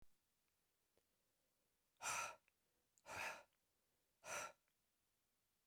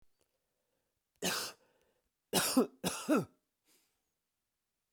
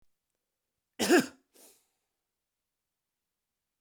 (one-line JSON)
{"exhalation_length": "5.7 s", "exhalation_amplitude": 636, "exhalation_signal_mean_std_ratio": 0.34, "three_cough_length": "4.9 s", "three_cough_amplitude": 4730, "three_cough_signal_mean_std_ratio": 0.32, "cough_length": "3.8 s", "cough_amplitude": 9277, "cough_signal_mean_std_ratio": 0.2, "survey_phase": "beta (2021-08-13 to 2022-03-07)", "age": "45-64", "gender": "Male", "wearing_mask": "No", "symptom_runny_or_blocked_nose": true, "smoker_status": "Never smoked", "respiratory_condition_asthma": false, "respiratory_condition_other": false, "recruitment_source": "Test and Trace", "submission_delay": "1 day", "covid_test_result": "Positive", "covid_test_method": "RT-qPCR", "covid_ct_value": 23.5, "covid_ct_gene": "ORF1ab gene", "covid_ct_mean": 24.1, "covid_viral_load": "12000 copies/ml", "covid_viral_load_category": "Low viral load (10K-1M copies/ml)"}